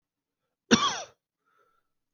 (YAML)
cough_length: 2.1 s
cough_amplitude: 21128
cough_signal_mean_std_ratio: 0.25
survey_phase: beta (2021-08-13 to 2022-03-07)
age: 18-44
gender: Male
wearing_mask: 'No'
symptom_cough_any: true
symptom_sore_throat: true
symptom_headache: true
smoker_status: Ex-smoker
respiratory_condition_asthma: false
respiratory_condition_other: false
recruitment_source: Test and Trace
submission_delay: 2 days
covid_test_result: Positive
covid_test_method: RT-qPCR
covid_ct_value: 20.9
covid_ct_gene: N gene